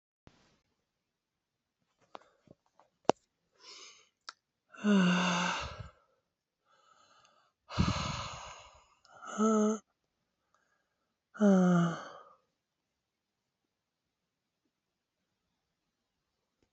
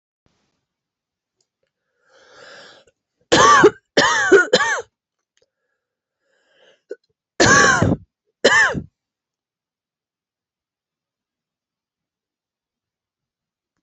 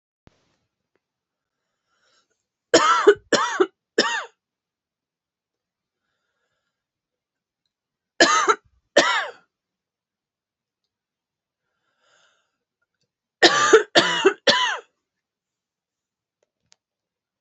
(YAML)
exhalation_length: 16.7 s
exhalation_amplitude: 16415
exhalation_signal_mean_std_ratio: 0.31
cough_length: 13.8 s
cough_amplitude: 31176
cough_signal_mean_std_ratio: 0.3
three_cough_length: 17.4 s
three_cough_amplitude: 32768
three_cough_signal_mean_std_ratio: 0.28
survey_phase: beta (2021-08-13 to 2022-03-07)
age: 45-64
gender: Female
wearing_mask: 'No'
symptom_cough_any: true
symptom_runny_or_blocked_nose: true
symptom_sore_throat: true
symptom_fatigue: true
symptom_fever_high_temperature: true
symptom_headache: true
smoker_status: Never smoked
respiratory_condition_asthma: true
respiratory_condition_other: false
recruitment_source: Test and Trace
submission_delay: 3 days
covid_test_result: Positive
covid_test_method: RT-qPCR
covid_ct_value: 20.6
covid_ct_gene: ORF1ab gene
covid_ct_mean: 20.9
covid_viral_load: 140000 copies/ml
covid_viral_load_category: Low viral load (10K-1M copies/ml)